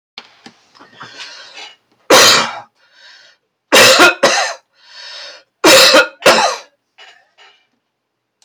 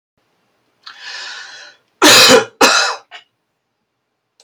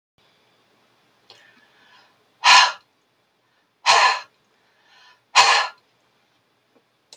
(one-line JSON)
{"three_cough_length": "8.4 s", "three_cough_amplitude": 32768, "three_cough_signal_mean_std_ratio": 0.42, "cough_length": "4.4 s", "cough_amplitude": 32768, "cough_signal_mean_std_ratio": 0.37, "exhalation_length": "7.2 s", "exhalation_amplitude": 31048, "exhalation_signal_mean_std_ratio": 0.28, "survey_phase": "beta (2021-08-13 to 2022-03-07)", "age": "65+", "gender": "Male", "wearing_mask": "No", "symptom_none": true, "smoker_status": "Never smoked", "respiratory_condition_asthma": false, "respiratory_condition_other": false, "recruitment_source": "REACT", "submission_delay": "2 days", "covid_test_result": "Negative", "covid_test_method": "RT-qPCR"}